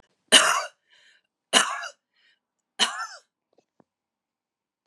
{
  "three_cough_length": "4.9 s",
  "three_cough_amplitude": 32375,
  "three_cough_signal_mean_std_ratio": 0.27,
  "survey_phase": "beta (2021-08-13 to 2022-03-07)",
  "age": "65+",
  "gender": "Female",
  "wearing_mask": "No",
  "symptom_none": true,
  "smoker_status": "Ex-smoker",
  "respiratory_condition_asthma": false,
  "respiratory_condition_other": false,
  "recruitment_source": "REACT",
  "submission_delay": "3 days",
  "covid_test_result": "Negative",
  "covid_test_method": "RT-qPCR",
  "influenza_a_test_result": "Negative",
  "influenza_b_test_result": "Negative"
}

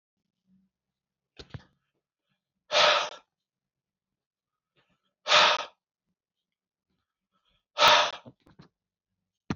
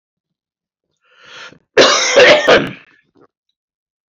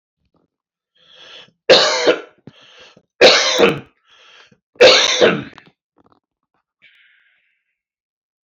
{
  "exhalation_length": "9.6 s",
  "exhalation_amplitude": 15665,
  "exhalation_signal_mean_std_ratio": 0.26,
  "cough_length": "4.1 s",
  "cough_amplitude": 31233,
  "cough_signal_mean_std_ratio": 0.39,
  "three_cough_length": "8.4 s",
  "three_cough_amplitude": 32768,
  "three_cough_signal_mean_std_ratio": 0.34,
  "survey_phase": "beta (2021-08-13 to 2022-03-07)",
  "age": "45-64",
  "gender": "Male",
  "wearing_mask": "No",
  "symptom_none": true,
  "symptom_onset": "12 days",
  "smoker_status": "Never smoked",
  "respiratory_condition_asthma": false,
  "respiratory_condition_other": false,
  "recruitment_source": "REACT",
  "submission_delay": "4 days",
  "covid_test_result": "Negative",
  "covid_test_method": "RT-qPCR",
  "influenza_a_test_result": "Negative",
  "influenza_b_test_result": "Negative"
}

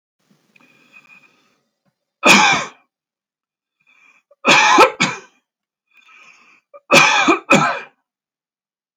{
  "three_cough_length": "9.0 s",
  "three_cough_amplitude": 32768,
  "three_cough_signal_mean_std_ratio": 0.35,
  "survey_phase": "alpha (2021-03-01 to 2021-08-12)",
  "age": "65+",
  "gender": "Male",
  "wearing_mask": "No",
  "symptom_none": true,
  "smoker_status": "Never smoked",
  "respiratory_condition_asthma": false,
  "respiratory_condition_other": false,
  "recruitment_source": "REACT",
  "submission_delay": "1 day",
  "covid_test_result": "Negative",
  "covid_test_method": "RT-qPCR"
}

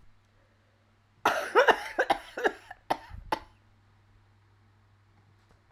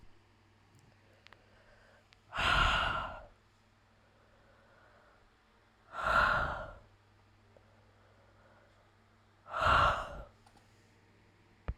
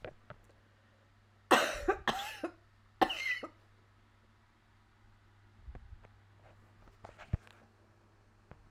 {
  "cough_length": "5.7 s",
  "cough_amplitude": 19335,
  "cough_signal_mean_std_ratio": 0.3,
  "exhalation_length": "11.8 s",
  "exhalation_amplitude": 5274,
  "exhalation_signal_mean_std_ratio": 0.36,
  "three_cough_length": "8.7 s",
  "three_cough_amplitude": 11493,
  "three_cough_signal_mean_std_ratio": 0.29,
  "survey_phase": "alpha (2021-03-01 to 2021-08-12)",
  "age": "65+",
  "gender": "Female",
  "wearing_mask": "No",
  "symptom_cough_any": true,
  "symptom_shortness_of_breath": true,
  "symptom_abdominal_pain": true,
  "symptom_diarrhoea": true,
  "symptom_fatigue": true,
  "symptom_fever_high_temperature": true,
  "symptom_headache": true,
  "symptom_onset": "3 days",
  "smoker_status": "Never smoked",
  "respiratory_condition_asthma": false,
  "respiratory_condition_other": false,
  "recruitment_source": "Test and Trace",
  "submission_delay": "2 days",
  "covid_test_result": "Positive",
  "covid_test_method": "RT-qPCR",
  "covid_ct_value": 15.1,
  "covid_ct_gene": "ORF1ab gene",
  "covid_ct_mean": 15.5,
  "covid_viral_load": "8300000 copies/ml",
  "covid_viral_load_category": "High viral load (>1M copies/ml)"
}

